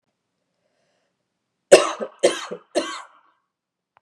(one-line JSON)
{"three_cough_length": "4.0 s", "three_cough_amplitude": 32768, "three_cough_signal_mean_std_ratio": 0.23, "survey_phase": "beta (2021-08-13 to 2022-03-07)", "age": "18-44", "gender": "Female", "wearing_mask": "No", "symptom_runny_or_blocked_nose": true, "symptom_sore_throat": true, "symptom_fatigue": true, "symptom_change_to_sense_of_smell_or_taste": true, "smoker_status": "Never smoked", "respiratory_condition_asthma": false, "respiratory_condition_other": false, "recruitment_source": "Test and Trace", "submission_delay": "2 days", "covid_test_result": "Positive", "covid_test_method": "ePCR"}